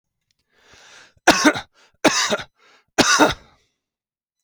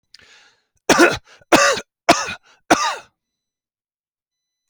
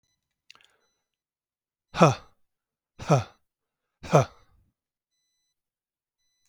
{
  "three_cough_length": "4.4 s",
  "three_cough_amplitude": 32768,
  "three_cough_signal_mean_std_ratio": 0.35,
  "cough_length": "4.7 s",
  "cough_amplitude": 32416,
  "cough_signal_mean_std_ratio": 0.33,
  "exhalation_length": "6.5 s",
  "exhalation_amplitude": 24214,
  "exhalation_signal_mean_std_ratio": 0.2,
  "survey_phase": "alpha (2021-03-01 to 2021-08-12)",
  "age": "65+",
  "gender": "Male",
  "wearing_mask": "No",
  "symptom_none": true,
  "smoker_status": "Ex-smoker",
  "respiratory_condition_asthma": false,
  "respiratory_condition_other": false,
  "recruitment_source": "REACT",
  "submission_delay": "2 days",
  "covid_test_result": "Negative",
  "covid_test_method": "RT-qPCR"
}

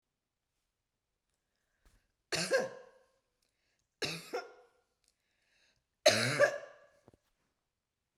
{
  "three_cough_length": "8.2 s",
  "three_cough_amplitude": 9119,
  "three_cough_signal_mean_std_ratio": 0.27,
  "survey_phase": "beta (2021-08-13 to 2022-03-07)",
  "age": "45-64",
  "gender": "Female",
  "wearing_mask": "No",
  "symptom_cough_any": true,
  "symptom_new_continuous_cough": true,
  "symptom_runny_or_blocked_nose": true,
  "symptom_fatigue": true,
  "symptom_onset": "4 days",
  "smoker_status": "Never smoked",
  "respiratory_condition_asthma": true,
  "respiratory_condition_other": false,
  "recruitment_source": "REACT",
  "submission_delay": "1 day",
  "covid_test_result": "Negative",
  "covid_test_method": "RT-qPCR",
  "influenza_a_test_result": "Unknown/Void",
  "influenza_b_test_result": "Unknown/Void"
}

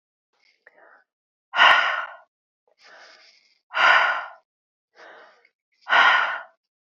{
  "exhalation_length": "7.0 s",
  "exhalation_amplitude": 23648,
  "exhalation_signal_mean_std_ratio": 0.36,
  "survey_phase": "beta (2021-08-13 to 2022-03-07)",
  "age": "45-64",
  "gender": "Female",
  "wearing_mask": "No",
  "symptom_cough_any": true,
  "symptom_runny_or_blocked_nose": true,
  "symptom_onset": "3 days",
  "smoker_status": "Ex-smoker",
  "respiratory_condition_asthma": false,
  "respiratory_condition_other": false,
  "recruitment_source": "Test and Trace",
  "submission_delay": "2 days",
  "covid_test_result": "Positive",
  "covid_test_method": "ePCR"
}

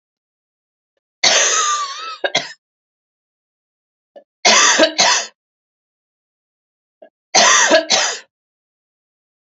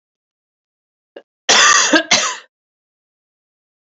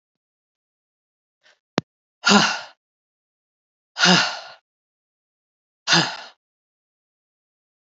{
  "three_cough_length": "9.6 s",
  "three_cough_amplitude": 32768,
  "three_cough_signal_mean_std_ratio": 0.4,
  "cough_length": "3.9 s",
  "cough_amplitude": 32768,
  "cough_signal_mean_std_ratio": 0.35,
  "exhalation_length": "7.9 s",
  "exhalation_amplitude": 32768,
  "exhalation_signal_mean_std_ratio": 0.26,
  "survey_phase": "beta (2021-08-13 to 2022-03-07)",
  "age": "45-64",
  "gender": "Female",
  "wearing_mask": "No",
  "symptom_cough_any": true,
  "symptom_runny_or_blocked_nose": true,
  "symptom_change_to_sense_of_smell_or_taste": true,
  "symptom_other": true,
  "symptom_onset": "4 days",
  "smoker_status": "Never smoked",
  "respiratory_condition_asthma": false,
  "respiratory_condition_other": false,
  "recruitment_source": "Test and Trace",
  "submission_delay": "1 day",
  "covid_test_result": "Positive",
  "covid_test_method": "RT-qPCR",
  "covid_ct_value": 22.0,
  "covid_ct_gene": "N gene"
}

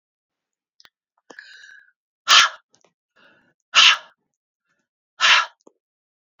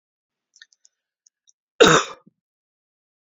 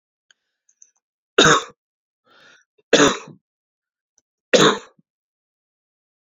{
  "exhalation_length": "6.4 s",
  "exhalation_amplitude": 32768,
  "exhalation_signal_mean_std_ratio": 0.26,
  "cough_length": "3.2 s",
  "cough_amplitude": 28664,
  "cough_signal_mean_std_ratio": 0.21,
  "three_cough_length": "6.2 s",
  "three_cough_amplitude": 31607,
  "three_cough_signal_mean_std_ratio": 0.26,
  "survey_phase": "beta (2021-08-13 to 2022-03-07)",
  "age": "45-64",
  "gender": "Female",
  "wearing_mask": "No",
  "symptom_cough_any": true,
  "symptom_runny_or_blocked_nose": true,
  "symptom_headache": true,
  "smoker_status": "Never smoked",
  "respiratory_condition_asthma": false,
  "respiratory_condition_other": false,
  "recruitment_source": "Test and Trace",
  "submission_delay": "1 day",
  "covid_test_result": "Positive",
  "covid_test_method": "RT-qPCR",
  "covid_ct_value": 18.0,
  "covid_ct_gene": "ORF1ab gene",
  "covid_ct_mean": 19.1,
  "covid_viral_load": "560000 copies/ml",
  "covid_viral_load_category": "Low viral load (10K-1M copies/ml)"
}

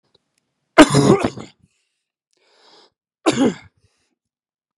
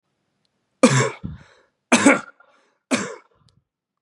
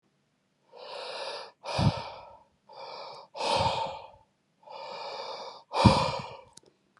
{
  "cough_length": "4.8 s",
  "cough_amplitude": 32768,
  "cough_signal_mean_std_ratio": 0.28,
  "three_cough_length": "4.0 s",
  "three_cough_amplitude": 31967,
  "three_cough_signal_mean_std_ratio": 0.32,
  "exhalation_length": "7.0 s",
  "exhalation_amplitude": 22441,
  "exhalation_signal_mean_std_ratio": 0.43,
  "survey_phase": "beta (2021-08-13 to 2022-03-07)",
  "age": "18-44",
  "gender": "Male",
  "wearing_mask": "No",
  "symptom_cough_any": true,
  "symptom_runny_or_blocked_nose": true,
  "symptom_fatigue": true,
  "symptom_fever_high_temperature": true,
  "symptom_change_to_sense_of_smell_or_taste": true,
  "symptom_loss_of_taste": true,
  "symptom_onset": "3 days",
  "smoker_status": "Never smoked",
  "respiratory_condition_asthma": false,
  "respiratory_condition_other": false,
  "recruitment_source": "Test and Trace",
  "submission_delay": "2 days",
  "covid_test_result": "Positive",
  "covid_test_method": "RT-qPCR",
  "covid_ct_value": 12.3,
  "covid_ct_gene": "S gene",
  "covid_ct_mean": 12.4,
  "covid_viral_load": "87000000 copies/ml",
  "covid_viral_load_category": "High viral load (>1M copies/ml)"
}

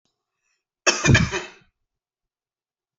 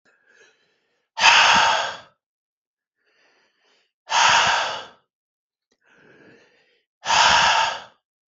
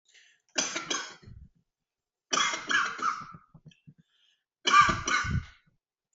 {
  "cough_length": "3.0 s",
  "cough_amplitude": 25940,
  "cough_signal_mean_std_ratio": 0.29,
  "exhalation_length": "8.3 s",
  "exhalation_amplitude": 32768,
  "exhalation_signal_mean_std_ratio": 0.41,
  "three_cough_length": "6.1 s",
  "three_cough_amplitude": 12446,
  "three_cough_signal_mean_std_ratio": 0.41,
  "survey_phase": "beta (2021-08-13 to 2022-03-07)",
  "age": "18-44",
  "gender": "Male",
  "wearing_mask": "No",
  "symptom_none": true,
  "smoker_status": "Never smoked",
  "respiratory_condition_asthma": false,
  "respiratory_condition_other": false,
  "recruitment_source": "REACT",
  "submission_delay": "1 day",
  "covid_test_result": "Negative",
  "covid_test_method": "RT-qPCR"
}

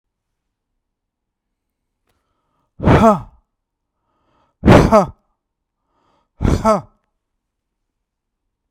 {
  "exhalation_length": "8.7 s",
  "exhalation_amplitude": 32768,
  "exhalation_signal_mean_std_ratio": 0.27,
  "survey_phase": "beta (2021-08-13 to 2022-03-07)",
  "age": "45-64",
  "gender": "Male",
  "wearing_mask": "No",
  "symptom_none": true,
  "smoker_status": "Ex-smoker",
  "respiratory_condition_asthma": false,
  "respiratory_condition_other": false,
  "recruitment_source": "REACT",
  "submission_delay": "1 day",
  "covid_test_result": "Negative",
  "covid_test_method": "RT-qPCR",
  "influenza_a_test_result": "Negative",
  "influenza_b_test_result": "Negative"
}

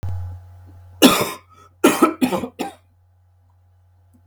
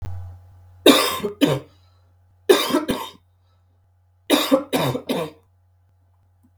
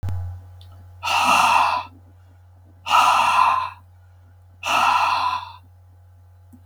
{
  "cough_length": "4.3 s",
  "cough_amplitude": 32768,
  "cough_signal_mean_std_ratio": 0.37,
  "three_cough_length": "6.6 s",
  "three_cough_amplitude": 32768,
  "three_cough_signal_mean_std_ratio": 0.41,
  "exhalation_length": "6.7 s",
  "exhalation_amplitude": 23060,
  "exhalation_signal_mean_std_ratio": 0.59,
  "survey_phase": "beta (2021-08-13 to 2022-03-07)",
  "age": "45-64",
  "gender": "Male",
  "wearing_mask": "No",
  "symptom_cough_any": true,
  "symptom_new_continuous_cough": true,
  "symptom_sore_throat": true,
  "symptom_onset": "12 days",
  "smoker_status": "Never smoked",
  "respiratory_condition_asthma": false,
  "respiratory_condition_other": false,
  "recruitment_source": "REACT",
  "submission_delay": "2 days",
  "covid_test_result": "Negative",
  "covid_test_method": "RT-qPCR",
  "influenza_a_test_result": "Negative",
  "influenza_b_test_result": "Negative"
}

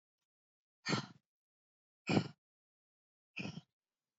{
  "exhalation_length": "4.2 s",
  "exhalation_amplitude": 4692,
  "exhalation_signal_mean_std_ratio": 0.25,
  "survey_phase": "beta (2021-08-13 to 2022-03-07)",
  "age": "18-44",
  "gender": "Female",
  "wearing_mask": "No",
  "symptom_cough_any": true,
  "symptom_runny_or_blocked_nose": true,
  "symptom_shortness_of_breath": true,
  "symptom_sore_throat": true,
  "symptom_fatigue": true,
  "symptom_headache": true,
  "symptom_change_to_sense_of_smell_or_taste": true,
  "symptom_loss_of_taste": true,
  "symptom_other": true,
  "symptom_onset": "5 days",
  "smoker_status": "Never smoked",
  "respiratory_condition_asthma": false,
  "respiratory_condition_other": false,
  "recruitment_source": "Test and Trace",
  "submission_delay": "1 day",
  "covid_test_result": "Positive",
  "covid_test_method": "RT-qPCR",
  "covid_ct_value": 15.0,
  "covid_ct_gene": "ORF1ab gene"
}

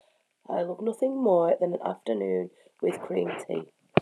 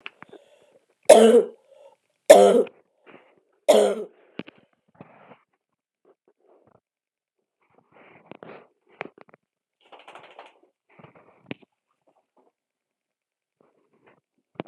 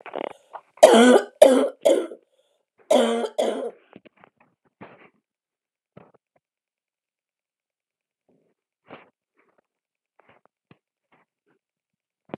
{
  "exhalation_length": "4.0 s",
  "exhalation_amplitude": 24997,
  "exhalation_signal_mean_std_ratio": 0.62,
  "three_cough_length": "14.7 s",
  "three_cough_amplitude": 32768,
  "three_cough_signal_mean_std_ratio": 0.2,
  "cough_length": "12.4 s",
  "cough_amplitude": 32768,
  "cough_signal_mean_std_ratio": 0.25,
  "survey_phase": "alpha (2021-03-01 to 2021-08-12)",
  "age": "45-64",
  "gender": "Female",
  "wearing_mask": "No",
  "symptom_cough_any": true,
  "symptom_new_continuous_cough": true,
  "symptom_abdominal_pain": true,
  "symptom_diarrhoea": true,
  "symptom_fatigue": true,
  "symptom_headache": true,
  "smoker_status": "Never smoked",
  "respiratory_condition_asthma": true,
  "respiratory_condition_other": false,
  "recruitment_source": "Test and Trace",
  "submission_delay": "2 days",
  "covid_test_result": "Positive",
  "covid_test_method": "RT-qPCR",
  "covid_ct_value": 21.9,
  "covid_ct_gene": "ORF1ab gene",
  "covid_ct_mean": 22.4,
  "covid_viral_load": "43000 copies/ml",
  "covid_viral_load_category": "Low viral load (10K-1M copies/ml)"
}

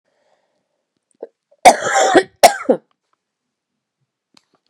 {
  "cough_length": "4.7 s",
  "cough_amplitude": 32768,
  "cough_signal_mean_std_ratio": 0.27,
  "survey_phase": "beta (2021-08-13 to 2022-03-07)",
  "age": "45-64",
  "gender": "Female",
  "wearing_mask": "No",
  "symptom_cough_any": true,
  "symptom_runny_or_blocked_nose": true,
  "symptom_shortness_of_breath": true,
  "symptom_diarrhoea": true,
  "symptom_fatigue": true,
  "symptom_headache": true,
  "symptom_onset": "6 days",
  "smoker_status": "Never smoked",
  "respiratory_condition_asthma": true,
  "respiratory_condition_other": false,
  "recruitment_source": "Test and Trace",
  "submission_delay": "2 days",
  "covid_test_result": "Positive",
  "covid_test_method": "RT-qPCR",
  "covid_ct_value": 25.1,
  "covid_ct_gene": "ORF1ab gene"
}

